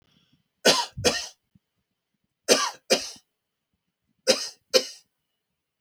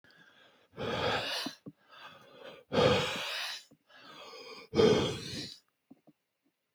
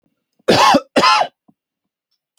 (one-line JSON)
{"three_cough_length": "5.8 s", "three_cough_amplitude": 26362, "three_cough_signal_mean_std_ratio": 0.3, "exhalation_length": "6.7 s", "exhalation_amplitude": 8182, "exhalation_signal_mean_std_ratio": 0.45, "cough_length": "2.4 s", "cough_amplitude": 30657, "cough_signal_mean_std_ratio": 0.43, "survey_phase": "beta (2021-08-13 to 2022-03-07)", "age": "45-64", "gender": "Male", "wearing_mask": "No", "symptom_none": true, "smoker_status": "Never smoked", "respiratory_condition_asthma": false, "respiratory_condition_other": false, "recruitment_source": "REACT", "submission_delay": "2 days", "covid_test_result": "Negative", "covid_test_method": "RT-qPCR"}